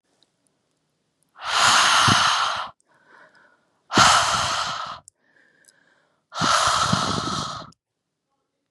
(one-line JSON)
{"exhalation_length": "8.7 s", "exhalation_amplitude": 26760, "exhalation_signal_mean_std_ratio": 0.5, "survey_phase": "beta (2021-08-13 to 2022-03-07)", "age": "18-44", "gender": "Female", "wearing_mask": "No", "symptom_cough_any": true, "symptom_new_continuous_cough": true, "symptom_shortness_of_breath": true, "smoker_status": "Never smoked", "respiratory_condition_asthma": false, "respiratory_condition_other": false, "recruitment_source": "Test and Trace", "submission_delay": "1 day", "covid_test_result": "Positive", "covid_test_method": "RT-qPCR", "covid_ct_value": 25.1, "covid_ct_gene": "N gene"}